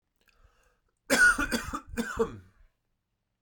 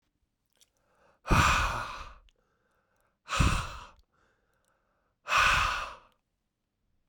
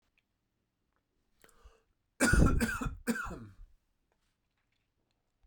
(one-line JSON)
{"cough_length": "3.4 s", "cough_amplitude": 9185, "cough_signal_mean_std_ratio": 0.38, "exhalation_length": "7.1 s", "exhalation_amplitude": 10197, "exhalation_signal_mean_std_ratio": 0.38, "three_cough_length": "5.5 s", "three_cough_amplitude": 7555, "three_cough_signal_mean_std_ratio": 0.32, "survey_phase": "beta (2021-08-13 to 2022-03-07)", "age": "18-44", "gender": "Male", "wearing_mask": "No", "symptom_sore_throat": true, "symptom_onset": "3 days", "smoker_status": "Never smoked", "respiratory_condition_asthma": false, "respiratory_condition_other": false, "recruitment_source": "Test and Trace", "submission_delay": "2 days", "covid_test_result": "Positive", "covid_test_method": "RT-qPCR", "covid_ct_value": 29.2, "covid_ct_gene": "ORF1ab gene", "covid_ct_mean": 29.5, "covid_viral_load": "210 copies/ml", "covid_viral_load_category": "Minimal viral load (< 10K copies/ml)"}